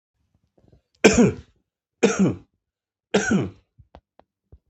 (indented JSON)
{
  "three_cough_length": "4.7 s",
  "three_cough_amplitude": 32768,
  "three_cough_signal_mean_std_ratio": 0.33,
  "survey_phase": "beta (2021-08-13 to 2022-03-07)",
  "age": "45-64",
  "gender": "Male",
  "wearing_mask": "No",
  "symptom_cough_any": true,
  "symptom_runny_or_blocked_nose": true,
  "symptom_fatigue": true,
  "symptom_headache": true,
  "symptom_change_to_sense_of_smell_or_taste": true,
  "smoker_status": "Never smoked",
  "respiratory_condition_asthma": true,
  "respiratory_condition_other": false,
  "recruitment_source": "Test and Trace",
  "submission_delay": "1 day",
  "covid_test_result": "Positive",
  "covid_test_method": "LFT"
}